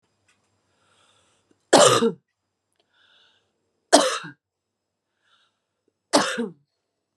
{"three_cough_length": "7.2 s", "three_cough_amplitude": 32433, "three_cough_signal_mean_std_ratio": 0.26, "survey_phase": "alpha (2021-03-01 to 2021-08-12)", "age": "18-44", "gender": "Female", "wearing_mask": "No", "symptom_cough_any": true, "symptom_shortness_of_breath": true, "symptom_fatigue": true, "symptom_headache": true, "symptom_change_to_sense_of_smell_or_taste": true, "symptom_loss_of_taste": true, "smoker_status": "Ex-smoker", "respiratory_condition_asthma": false, "respiratory_condition_other": false, "recruitment_source": "Test and Trace", "submission_delay": "2 days", "covid_test_result": "Positive", "covid_test_method": "RT-qPCR", "covid_ct_value": 18.6, "covid_ct_gene": "ORF1ab gene", "covid_ct_mean": 19.0, "covid_viral_load": "570000 copies/ml", "covid_viral_load_category": "Low viral load (10K-1M copies/ml)"}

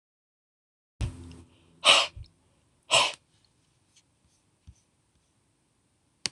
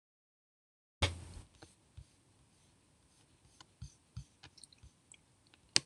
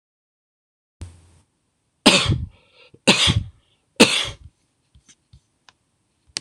{"exhalation_length": "6.3 s", "exhalation_amplitude": 22170, "exhalation_signal_mean_std_ratio": 0.23, "cough_length": "5.9 s", "cough_amplitude": 22572, "cough_signal_mean_std_ratio": 0.18, "three_cough_length": "6.4 s", "three_cough_amplitude": 26028, "three_cough_signal_mean_std_ratio": 0.29, "survey_phase": "beta (2021-08-13 to 2022-03-07)", "age": "65+", "gender": "Male", "wearing_mask": "No", "symptom_none": true, "smoker_status": "Ex-smoker", "respiratory_condition_asthma": false, "respiratory_condition_other": false, "recruitment_source": "REACT", "submission_delay": "3 days", "covid_test_result": "Negative", "covid_test_method": "RT-qPCR"}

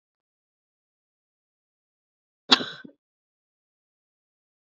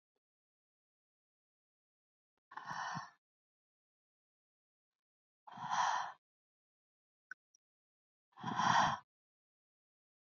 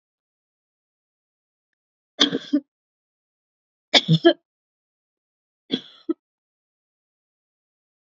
{"cough_length": "4.6 s", "cough_amplitude": 27873, "cough_signal_mean_std_ratio": 0.11, "exhalation_length": "10.3 s", "exhalation_amplitude": 3610, "exhalation_signal_mean_std_ratio": 0.27, "three_cough_length": "8.1 s", "three_cough_amplitude": 27921, "three_cough_signal_mean_std_ratio": 0.19, "survey_phase": "beta (2021-08-13 to 2022-03-07)", "age": "18-44", "gender": "Female", "wearing_mask": "No", "symptom_cough_any": true, "symptom_fatigue": true, "symptom_headache": true, "symptom_onset": "4 days", "smoker_status": "Never smoked", "respiratory_condition_asthma": false, "respiratory_condition_other": false, "recruitment_source": "Test and Trace", "submission_delay": "2 days", "covid_test_result": "Positive", "covid_test_method": "RT-qPCR", "covid_ct_value": 31.9, "covid_ct_gene": "N gene"}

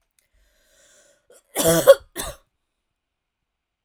{"cough_length": "3.8 s", "cough_amplitude": 32768, "cough_signal_mean_std_ratio": 0.22, "survey_phase": "alpha (2021-03-01 to 2021-08-12)", "age": "18-44", "gender": "Female", "wearing_mask": "No", "symptom_none": true, "symptom_onset": "4 days", "smoker_status": "Never smoked", "respiratory_condition_asthma": false, "respiratory_condition_other": false, "recruitment_source": "REACT", "submission_delay": "2 days", "covid_test_result": "Negative", "covid_test_method": "RT-qPCR"}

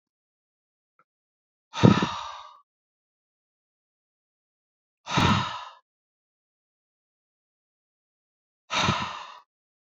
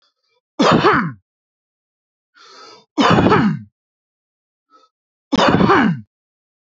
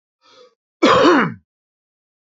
{"exhalation_length": "9.9 s", "exhalation_amplitude": 26485, "exhalation_signal_mean_std_ratio": 0.25, "three_cough_length": "6.7 s", "three_cough_amplitude": 30692, "three_cough_signal_mean_std_ratio": 0.44, "cough_length": "2.4 s", "cough_amplitude": 29043, "cough_signal_mean_std_ratio": 0.38, "survey_phase": "beta (2021-08-13 to 2022-03-07)", "age": "18-44", "gender": "Male", "wearing_mask": "No", "symptom_none": true, "smoker_status": "Never smoked", "respiratory_condition_asthma": false, "respiratory_condition_other": false, "recruitment_source": "REACT", "submission_delay": "1 day", "covid_test_result": "Negative", "covid_test_method": "RT-qPCR", "influenza_a_test_result": "Negative", "influenza_b_test_result": "Negative"}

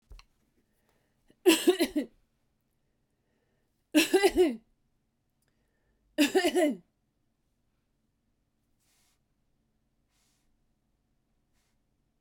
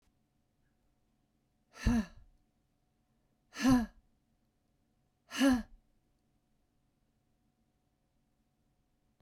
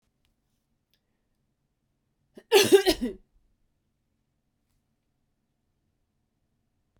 {"three_cough_length": "12.2 s", "three_cough_amplitude": 10522, "three_cough_signal_mean_std_ratio": 0.27, "exhalation_length": "9.2 s", "exhalation_amplitude": 5140, "exhalation_signal_mean_std_ratio": 0.24, "cough_length": "7.0 s", "cough_amplitude": 18147, "cough_signal_mean_std_ratio": 0.19, "survey_phase": "beta (2021-08-13 to 2022-03-07)", "age": "45-64", "gender": "Female", "wearing_mask": "No", "symptom_none": true, "smoker_status": "Never smoked", "respiratory_condition_asthma": false, "respiratory_condition_other": false, "recruitment_source": "REACT", "submission_delay": "1 day", "covid_test_result": "Negative", "covid_test_method": "RT-qPCR", "influenza_a_test_result": "Negative", "influenza_b_test_result": "Negative"}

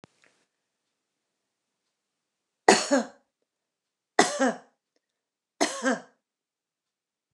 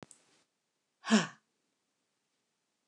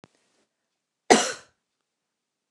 {"three_cough_length": "7.3 s", "three_cough_amplitude": 29203, "three_cough_signal_mean_std_ratio": 0.24, "exhalation_length": "2.9 s", "exhalation_amplitude": 7866, "exhalation_signal_mean_std_ratio": 0.19, "cough_length": "2.5 s", "cough_amplitude": 29203, "cough_signal_mean_std_ratio": 0.19, "survey_phase": "beta (2021-08-13 to 2022-03-07)", "age": "65+", "gender": "Female", "wearing_mask": "No", "symptom_none": true, "smoker_status": "Ex-smoker", "respiratory_condition_asthma": false, "respiratory_condition_other": false, "recruitment_source": "REACT", "submission_delay": "1 day", "covid_test_result": "Negative", "covid_test_method": "RT-qPCR"}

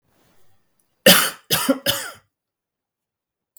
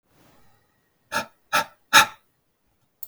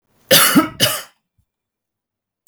{"three_cough_length": "3.6 s", "three_cough_amplitude": 32768, "three_cough_signal_mean_std_ratio": 0.3, "exhalation_length": "3.1 s", "exhalation_amplitude": 31961, "exhalation_signal_mean_std_ratio": 0.23, "cough_length": "2.5 s", "cough_amplitude": 32768, "cough_signal_mean_std_ratio": 0.37, "survey_phase": "beta (2021-08-13 to 2022-03-07)", "age": "45-64", "gender": "Male", "wearing_mask": "No", "symptom_none": true, "smoker_status": "Never smoked", "respiratory_condition_asthma": false, "respiratory_condition_other": false, "recruitment_source": "REACT", "submission_delay": "1 day", "covid_test_result": "Negative", "covid_test_method": "RT-qPCR", "influenza_a_test_result": "Negative", "influenza_b_test_result": "Negative"}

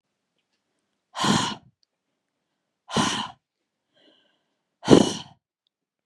{"exhalation_length": "6.1 s", "exhalation_amplitude": 32767, "exhalation_signal_mean_std_ratio": 0.26, "survey_phase": "beta (2021-08-13 to 2022-03-07)", "age": "18-44", "gender": "Female", "wearing_mask": "No", "symptom_none": true, "symptom_onset": "6 days", "smoker_status": "Never smoked", "respiratory_condition_asthma": false, "respiratory_condition_other": false, "recruitment_source": "REACT", "submission_delay": "7 days", "covid_test_result": "Negative", "covid_test_method": "RT-qPCR", "influenza_a_test_result": "Negative", "influenza_b_test_result": "Negative"}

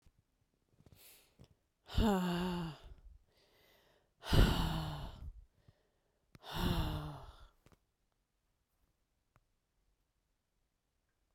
{"exhalation_length": "11.3 s", "exhalation_amplitude": 6725, "exhalation_signal_mean_std_ratio": 0.35, "survey_phase": "beta (2021-08-13 to 2022-03-07)", "age": "45-64", "gender": "Female", "wearing_mask": "No", "symptom_cough_any": true, "symptom_runny_or_blocked_nose": true, "symptom_shortness_of_breath": true, "symptom_abdominal_pain": true, "symptom_fatigue": true, "symptom_fever_high_temperature": true, "symptom_headache": true, "symptom_other": true, "smoker_status": "Never smoked", "respiratory_condition_asthma": false, "respiratory_condition_other": false, "recruitment_source": "Test and Trace", "submission_delay": "1 day", "covid_test_result": "Positive", "covid_test_method": "LFT"}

